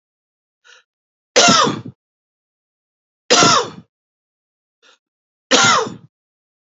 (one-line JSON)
{"three_cough_length": "6.7 s", "three_cough_amplitude": 32767, "three_cough_signal_mean_std_ratio": 0.34, "survey_phase": "beta (2021-08-13 to 2022-03-07)", "age": "45-64", "gender": "Male", "wearing_mask": "No", "symptom_none": true, "smoker_status": "Never smoked", "respiratory_condition_asthma": false, "respiratory_condition_other": false, "recruitment_source": "Test and Trace", "submission_delay": "2 days", "covid_test_result": "Positive", "covid_test_method": "ePCR"}